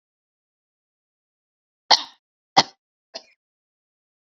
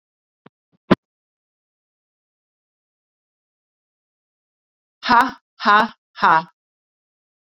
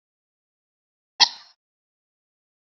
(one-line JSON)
{"three_cough_length": "4.4 s", "three_cough_amplitude": 28429, "three_cough_signal_mean_std_ratio": 0.13, "exhalation_length": "7.4 s", "exhalation_amplitude": 29522, "exhalation_signal_mean_std_ratio": 0.22, "cough_length": "2.7 s", "cough_amplitude": 28506, "cough_signal_mean_std_ratio": 0.12, "survey_phase": "beta (2021-08-13 to 2022-03-07)", "age": "45-64", "gender": "Female", "wearing_mask": "No", "symptom_sore_throat": true, "symptom_fatigue": true, "smoker_status": "Never smoked", "respiratory_condition_asthma": false, "respiratory_condition_other": false, "recruitment_source": "Test and Trace", "submission_delay": "2 days", "covid_test_result": "Positive", "covid_test_method": "RT-qPCR", "covid_ct_value": 26.0, "covid_ct_gene": "S gene", "covid_ct_mean": 26.4, "covid_viral_load": "2100 copies/ml", "covid_viral_load_category": "Minimal viral load (< 10K copies/ml)"}